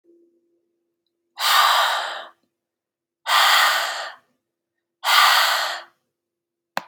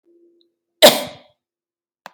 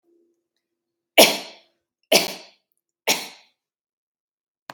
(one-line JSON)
{"exhalation_length": "6.9 s", "exhalation_amplitude": 24762, "exhalation_signal_mean_std_ratio": 0.47, "cough_length": "2.1 s", "cough_amplitude": 32768, "cough_signal_mean_std_ratio": 0.21, "three_cough_length": "4.7 s", "three_cough_amplitude": 32768, "three_cough_signal_mean_std_ratio": 0.22, "survey_phase": "beta (2021-08-13 to 2022-03-07)", "age": "45-64", "gender": "Female", "wearing_mask": "No", "symptom_none": true, "smoker_status": "Never smoked", "respiratory_condition_asthma": false, "respiratory_condition_other": false, "recruitment_source": "Test and Trace", "submission_delay": "1 day", "covid_test_result": "Negative", "covid_test_method": "ePCR"}